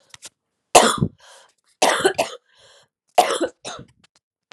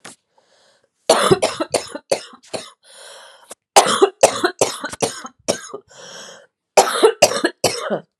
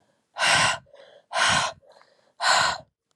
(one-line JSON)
{"three_cough_length": "4.5 s", "three_cough_amplitude": 32768, "three_cough_signal_mean_std_ratio": 0.34, "cough_length": "8.2 s", "cough_amplitude": 32768, "cough_signal_mean_std_ratio": 0.4, "exhalation_length": "3.2 s", "exhalation_amplitude": 15508, "exhalation_signal_mean_std_ratio": 0.52, "survey_phase": "beta (2021-08-13 to 2022-03-07)", "age": "18-44", "gender": "Female", "wearing_mask": "No", "symptom_cough_any": true, "symptom_runny_or_blocked_nose": true, "symptom_shortness_of_breath": true, "symptom_abdominal_pain": true, "symptom_diarrhoea": true, "symptom_fatigue": true, "symptom_fever_high_temperature": true, "symptom_headache": true, "symptom_change_to_sense_of_smell_or_taste": true, "symptom_loss_of_taste": true, "symptom_onset": "9 days", "smoker_status": "Never smoked", "respiratory_condition_asthma": true, "respiratory_condition_other": false, "recruitment_source": "Test and Trace", "submission_delay": "2 days", "covid_test_result": "Positive", "covid_test_method": "RT-qPCR", "covid_ct_value": 15.4, "covid_ct_gene": "ORF1ab gene", "covid_ct_mean": 15.8, "covid_viral_load": "6800000 copies/ml", "covid_viral_load_category": "High viral load (>1M copies/ml)"}